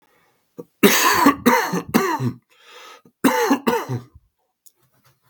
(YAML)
cough_length: 5.3 s
cough_amplitude: 32768
cough_signal_mean_std_ratio: 0.48
survey_phase: beta (2021-08-13 to 2022-03-07)
age: 18-44
gender: Male
wearing_mask: 'No'
symptom_cough_any: true
symptom_runny_or_blocked_nose: true
symptom_change_to_sense_of_smell_or_taste: true
symptom_loss_of_taste: true
symptom_onset: 3 days
smoker_status: Ex-smoker
respiratory_condition_asthma: false
respiratory_condition_other: false
recruitment_source: Test and Trace
submission_delay: 1 day
covid_test_result: Positive
covid_test_method: RT-qPCR